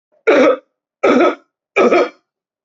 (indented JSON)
{
  "three_cough_length": "2.6 s",
  "three_cough_amplitude": 28072,
  "three_cough_signal_mean_std_ratio": 0.52,
  "survey_phase": "beta (2021-08-13 to 2022-03-07)",
  "age": "45-64",
  "gender": "Male",
  "wearing_mask": "No",
  "symptom_none": true,
  "symptom_onset": "12 days",
  "smoker_status": "Never smoked",
  "respiratory_condition_asthma": false,
  "respiratory_condition_other": false,
  "recruitment_source": "REACT",
  "submission_delay": "3 days",
  "covid_test_result": "Negative",
  "covid_test_method": "RT-qPCR"
}